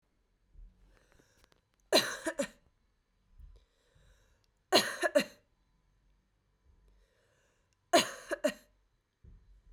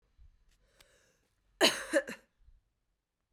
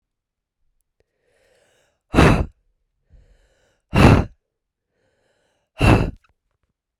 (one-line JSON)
{"three_cough_length": "9.7 s", "three_cough_amplitude": 9641, "three_cough_signal_mean_std_ratio": 0.25, "cough_length": "3.3 s", "cough_amplitude": 8154, "cough_signal_mean_std_ratio": 0.24, "exhalation_length": "7.0 s", "exhalation_amplitude": 32768, "exhalation_signal_mean_std_ratio": 0.27, "survey_phase": "beta (2021-08-13 to 2022-03-07)", "age": "18-44", "gender": "Female", "wearing_mask": "No", "symptom_cough_any": true, "symptom_runny_or_blocked_nose": true, "symptom_fatigue": true, "symptom_loss_of_taste": true, "smoker_status": "Never smoked", "respiratory_condition_asthma": true, "respiratory_condition_other": false, "recruitment_source": "Test and Trace", "submission_delay": "2 days", "covid_test_result": "Positive", "covid_test_method": "RT-qPCR", "covid_ct_value": 19.2, "covid_ct_gene": "ORF1ab gene"}